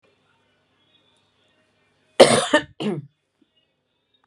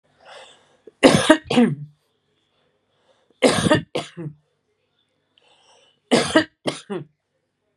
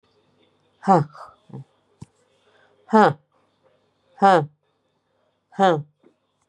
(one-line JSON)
{"cough_length": "4.3 s", "cough_amplitude": 32768, "cough_signal_mean_std_ratio": 0.23, "three_cough_length": "7.8 s", "three_cough_amplitude": 32768, "three_cough_signal_mean_std_ratio": 0.33, "exhalation_length": "6.5 s", "exhalation_amplitude": 28941, "exhalation_signal_mean_std_ratio": 0.27, "survey_phase": "beta (2021-08-13 to 2022-03-07)", "age": "45-64", "gender": "Female", "wearing_mask": "No", "symptom_sore_throat": true, "smoker_status": "Never smoked", "respiratory_condition_asthma": false, "respiratory_condition_other": false, "recruitment_source": "REACT", "submission_delay": "2 days", "covid_test_result": "Negative", "covid_test_method": "RT-qPCR", "influenza_a_test_result": "Negative", "influenza_b_test_result": "Negative"}